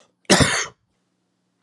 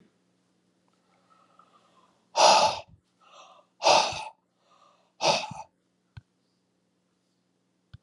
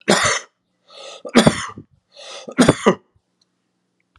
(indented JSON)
{
  "cough_length": "1.6 s",
  "cough_amplitude": 30953,
  "cough_signal_mean_std_ratio": 0.34,
  "exhalation_length": "8.0 s",
  "exhalation_amplitude": 17545,
  "exhalation_signal_mean_std_ratio": 0.28,
  "three_cough_length": "4.2 s",
  "three_cough_amplitude": 32768,
  "three_cough_signal_mean_std_ratio": 0.35,
  "survey_phase": "beta (2021-08-13 to 2022-03-07)",
  "age": "65+",
  "gender": "Male",
  "wearing_mask": "No",
  "symptom_none": true,
  "smoker_status": "Never smoked",
  "respiratory_condition_asthma": false,
  "respiratory_condition_other": false,
  "recruitment_source": "REACT",
  "submission_delay": "2 days",
  "covid_test_result": "Negative",
  "covid_test_method": "RT-qPCR",
  "influenza_a_test_result": "Negative",
  "influenza_b_test_result": "Negative"
}